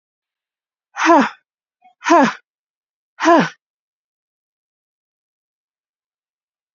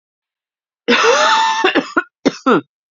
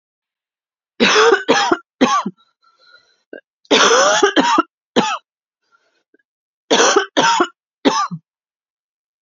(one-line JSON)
{"exhalation_length": "6.7 s", "exhalation_amplitude": 31133, "exhalation_signal_mean_std_ratio": 0.27, "cough_length": "2.9 s", "cough_amplitude": 32767, "cough_signal_mean_std_ratio": 0.57, "three_cough_length": "9.2 s", "three_cough_amplitude": 32768, "three_cough_signal_mean_std_ratio": 0.47, "survey_phase": "beta (2021-08-13 to 2022-03-07)", "age": "18-44", "gender": "Female", "wearing_mask": "Yes", "symptom_cough_any": true, "symptom_shortness_of_breath": true, "symptom_sore_throat": true, "symptom_fatigue": true, "symptom_change_to_sense_of_smell_or_taste": true, "symptom_loss_of_taste": true, "symptom_onset": "4 days", "smoker_status": "Ex-smoker", "respiratory_condition_asthma": false, "respiratory_condition_other": false, "recruitment_source": "Test and Trace", "submission_delay": "2 days", "covid_test_result": "Positive", "covid_test_method": "RT-qPCR", "covid_ct_value": 15.7, "covid_ct_gene": "ORF1ab gene", "covid_ct_mean": 15.8, "covid_viral_load": "6500000 copies/ml", "covid_viral_load_category": "High viral load (>1M copies/ml)"}